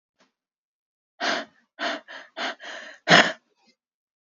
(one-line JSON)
{"exhalation_length": "4.3 s", "exhalation_amplitude": 27383, "exhalation_signal_mean_std_ratio": 0.29, "survey_phase": "beta (2021-08-13 to 2022-03-07)", "age": "18-44", "gender": "Female", "wearing_mask": "No", "symptom_cough_any": true, "symptom_new_continuous_cough": true, "symptom_sore_throat": true, "symptom_abdominal_pain": true, "symptom_fatigue": true, "symptom_fever_high_temperature": true, "symptom_headache": true, "symptom_change_to_sense_of_smell_or_taste": true, "symptom_loss_of_taste": true, "symptom_onset": "4 days", "smoker_status": "Current smoker (1 to 10 cigarettes per day)", "respiratory_condition_asthma": false, "respiratory_condition_other": false, "recruitment_source": "Test and Trace", "submission_delay": "2 days", "covid_test_result": "Positive", "covid_test_method": "LAMP"}